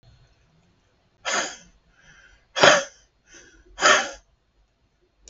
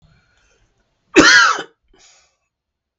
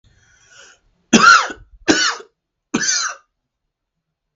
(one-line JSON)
{"exhalation_length": "5.3 s", "exhalation_amplitude": 32766, "exhalation_signal_mean_std_ratio": 0.28, "cough_length": "3.0 s", "cough_amplitude": 32768, "cough_signal_mean_std_ratio": 0.31, "three_cough_length": "4.4 s", "three_cough_amplitude": 32768, "three_cough_signal_mean_std_ratio": 0.35, "survey_phase": "beta (2021-08-13 to 2022-03-07)", "age": "45-64", "gender": "Male", "wearing_mask": "No", "symptom_runny_or_blocked_nose": true, "smoker_status": "Ex-smoker", "respiratory_condition_asthma": true, "respiratory_condition_other": false, "recruitment_source": "Test and Trace", "submission_delay": "3 days", "covid_test_result": "Negative", "covid_test_method": "ePCR"}